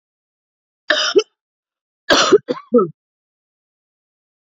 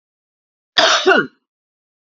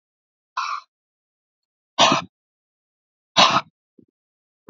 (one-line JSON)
{"three_cough_length": "4.4 s", "three_cough_amplitude": 28986, "three_cough_signal_mean_std_ratio": 0.32, "cough_length": "2.0 s", "cough_amplitude": 32767, "cough_signal_mean_std_ratio": 0.38, "exhalation_length": "4.7 s", "exhalation_amplitude": 32435, "exhalation_signal_mean_std_ratio": 0.27, "survey_phase": "beta (2021-08-13 to 2022-03-07)", "age": "45-64", "gender": "Female", "wearing_mask": "No", "symptom_cough_any": true, "symptom_diarrhoea": true, "smoker_status": "Current smoker (11 or more cigarettes per day)", "respiratory_condition_asthma": false, "respiratory_condition_other": false, "recruitment_source": "REACT", "submission_delay": "4 days", "covid_test_result": "Negative", "covid_test_method": "RT-qPCR", "influenza_a_test_result": "Unknown/Void", "influenza_b_test_result": "Unknown/Void"}